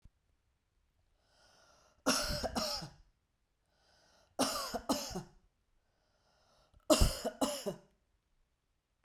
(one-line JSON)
{"three_cough_length": "9.0 s", "three_cough_amplitude": 6816, "three_cough_signal_mean_std_ratio": 0.34, "survey_phase": "beta (2021-08-13 to 2022-03-07)", "age": "45-64", "gender": "Female", "wearing_mask": "No", "symptom_runny_or_blocked_nose": true, "symptom_fatigue": true, "symptom_fever_high_temperature": true, "symptom_headache": true, "symptom_onset": "4 days", "smoker_status": "Never smoked", "respiratory_condition_asthma": false, "respiratory_condition_other": false, "recruitment_source": "Test and Trace", "submission_delay": "2 days", "covid_test_result": "Positive", "covid_test_method": "RT-qPCR", "covid_ct_value": 19.2, "covid_ct_gene": "ORF1ab gene", "covid_ct_mean": 20.1, "covid_viral_load": "260000 copies/ml", "covid_viral_load_category": "Low viral load (10K-1M copies/ml)"}